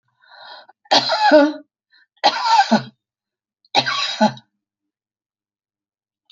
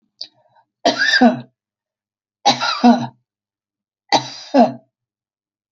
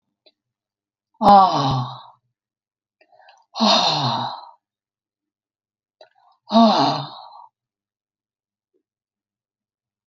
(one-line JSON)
{"three_cough_length": "6.3 s", "three_cough_amplitude": 28815, "three_cough_signal_mean_std_ratio": 0.39, "cough_length": "5.7 s", "cough_amplitude": 32112, "cough_signal_mean_std_ratio": 0.37, "exhalation_length": "10.1 s", "exhalation_amplitude": 28449, "exhalation_signal_mean_std_ratio": 0.32, "survey_phase": "alpha (2021-03-01 to 2021-08-12)", "age": "65+", "gender": "Female", "wearing_mask": "No", "symptom_none": true, "smoker_status": "Ex-smoker", "respiratory_condition_asthma": false, "respiratory_condition_other": false, "recruitment_source": "REACT", "submission_delay": "1 day", "covid_test_result": "Negative", "covid_test_method": "RT-qPCR"}